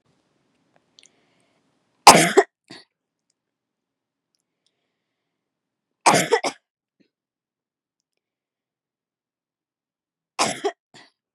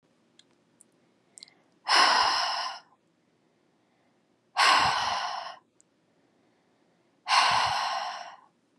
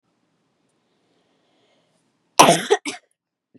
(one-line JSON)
{"three_cough_length": "11.3 s", "three_cough_amplitude": 32768, "three_cough_signal_mean_std_ratio": 0.18, "exhalation_length": "8.8 s", "exhalation_amplitude": 13684, "exhalation_signal_mean_std_ratio": 0.44, "cough_length": "3.6 s", "cough_amplitude": 32768, "cough_signal_mean_std_ratio": 0.22, "survey_phase": "beta (2021-08-13 to 2022-03-07)", "age": "18-44", "gender": "Female", "wearing_mask": "No", "symptom_none": true, "smoker_status": "Never smoked", "respiratory_condition_asthma": false, "respiratory_condition_other": false, "recruitment_source": "REACT", "submission_delay": "0 days", "covid_test_result": "Negative", "covid_test_method": "RT-qPCR"}